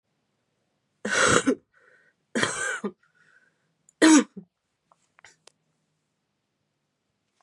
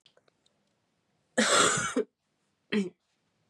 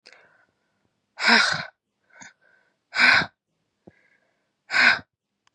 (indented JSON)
{
  "three_cough_length": "7.4 s",
  "three_cough_amplitude": 21720,
  "three_cough_signal_mean_std_ratio": 0.28,
  "cough_length": "3.5 s",
  "cough_amplitude": 10842,
  "cough_signal_mean_std_ratio": 0.38,
  "exhalation_length": "5.5 s",
  "exhalation_amplitude": 24321,
  "exhalation_signal_mean_std_ratio": 0.33,
  "survey_phase": "beta (2021-08-13 to 2022-03-07)",
  "age": "18-44",
  "gender": "Female",
  "wearing_mask": "No",
  "symptom_cough_any": true,
  "symptom_new_continuous_cough": true,
  "symptom_runny_or_blocked_nose": true,
  "symptom_sore_throat": true,
  "smoker_status": "Ex-smoker",
  "respiratory_condition_asthma": false,
  "respiratory_condition_other": false,
  "recruitment_source": "Test and Trace",
  "submission_delay": "1 day",
  "covid_test_result": "Positive",
  "covid_test_method": "LFT"
}